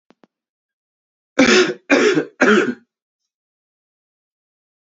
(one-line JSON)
{"three_cough_length": "4.9 s", "three_cough_amplitude": 27910, "three_cough_signal_mean_std_ratio": 0.36, "survey_phase": "beta (2021-08-13 to 2022-03-07)", "age": "18-44", "gender": "Male", "wearing_mask": "No", "symptom_new_continuous_cough": true, "symptom_sore_throat": true, "symptom_other": true, "symptom_onset": "4 days", "smoker_status": "Never smoked", "respiratory_condition_asthma": false, "respiratory_condition_other": false, "recruitment_source": "Test and Trace", "submission_delay": "1 day", "covid_test_result": "Positive", "covid_test_method": "RT-qPCR", "covid_ct_value": 26.4, "covid_ct_gene": "ORF1ab gene"}